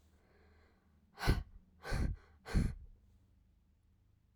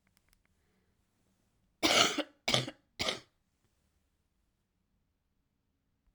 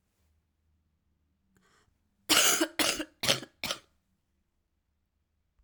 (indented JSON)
{
  "exhalation_length": "4.4 s",
  "exhalation_amplitude": 4046,
  "exhalation_signal_mean_std_ratio": 0.35,
  "three_cough_length": "6.1 s",
  "three_cough_amplitude": 13950,
  "three_cough_signal_mean_std_ratio": 0.25,
  "cough_length": "5.6 s",
  "cough_amplitude": 17494,
  "cough_signal_mean_std_ratio": 0.29,
  "survey_phase": "alpha (2021-03-01 to 2021-08-12)",
  "age": "18-44",
  "gender": "Female",
  "wearing_mask": "No",
  "symptom_cough_any": true,
  "symptom_new_continuous_cough": true,
  "symptom_abdominal_pain": true,
  "symptom_fatigue": true,
  "symptom_fever_high_temperature": true,
  "symptom_headache": true,
  "symptom_change_to_sense_of_smell_or_taste": true,
  "symptom_loss_of_taste": true,
  "symptom_onset": "6 days",
  "smoker_status": "Never smoked",
  "respiratory_condition_asthma": false,
  "respiratory_condition_other": false,
  "recruitment_source": "Test and Trace",
  "submission_delay": "1 day",
  "covid_test_result": "Positive",
  "covid_test_method": "RT-qPCR"
}